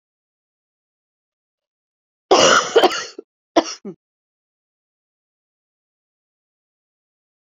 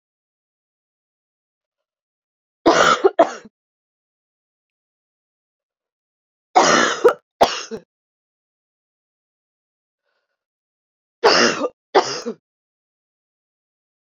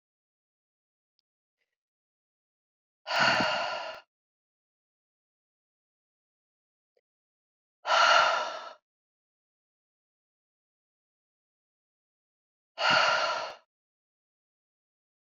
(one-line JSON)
{"cough_length": "7.6 s", "cough_amplitude": 30604, "cough_signal_mean_std_ratio": 0.23, "three_cough_length": "14.2 s", "three_cough_amplitude": 31112, "three_cough_signal_mean_std_ratio": 0.27, "exhalation_length": "15.3 s", "exhalation_amplitude": 13231, "exhalation_signal_mean_std_ratio": 0.29, "survey_phase": "beta (2021-08-13 to 2022-03-07)", "age": "45-64", "gender": "Female", "wearing_mask": "No", "symptom_cough_any": true, "symptom_runny_or_blocked_nose": true, "symptom_shortness_of_breath": true, "symptom_sore_throat": true, "symptom_fatigue": true, "symptom_fever_high_temperature": true, "symptom_headache": true, "symptom_change_to_sense_of_smell_or_taste": true, "symptom_loss_of_taste": true, "smoker_status": "Never smoked", "respiratory_condition_asthma": false, "respiratory_condition_other": false, "recruitment_source": "Test and Trace", "submission_delay": "2 days", "covid_test_result": "Positive", "covid_test_method": "LFT"}